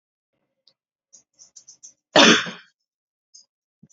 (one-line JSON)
{"cough_length": "3.9 s", "cough_amplitude": 29545, "cough_signal_mean_std_ratio": 0.22, "survey_phase": "beta (2021-08-13 to 2022-03-07)", "age": "18-44", "gender": "Female", "wearing_mask": "No", "symptom_none": true, "smoker_status": "Never smoked", "respiratory_condition_asthma": false, "respiratory_condition_other": false, "recruitment_source": "REACT", "submission_delay": "0 days", "covid_test_result": "Negative", "covid_test_method": "RT-qPCR"}